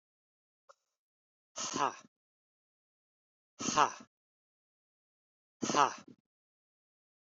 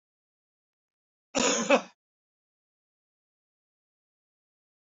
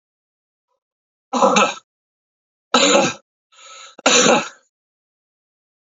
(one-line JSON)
{"exhalation_length": "7.3 s", "exhalation_amplitude": 9366, "exhalation_signal_mean_std_ratio": 0.23, "cough_length": "4.9 s", "cough_amplitude": 11841, "cough_signal_mean_std_ratio": 0.22, "three_cough_length": "6.0 s", "three_cough_amplitude": 32767, "three_cough_signal_mean_std_ratio": 0.36, "survey_phase": "beta (2021-08-13 to 2022-03-07)", "age": "45-64", "gender": "Male", "wearing_mask": "No", "symptom_cough_any": true, "symptom_new_continuous_cough": true, "symptom_runny_or_blocked_nose": true, "symptom_shortness_of_breath": true, "symptom_fatigue": true, "symptom_change_to_sense_of_smell_or_taste": true, "symptom_loss_of_taste": true, "symptom_onset": "6 days", "smoker_status": "Ex-smoker", "respiratory_condition_asthma": false, "respiratory_condition_other": false, "recruitment_source": "Test and Trace", "submission_delay": "1 day", "covid_test_result": "Positive", "covid_test_method": "RT-qPCR", "covid_ct_value": 14.6, "covid_ct_gene": "ORF1ab gene", "covid_ct_mean": 14.9, "covid_viral_load": "13000000 copies/ml", "covid_viral_load_category": "High viral load (>1M copies/ml)"}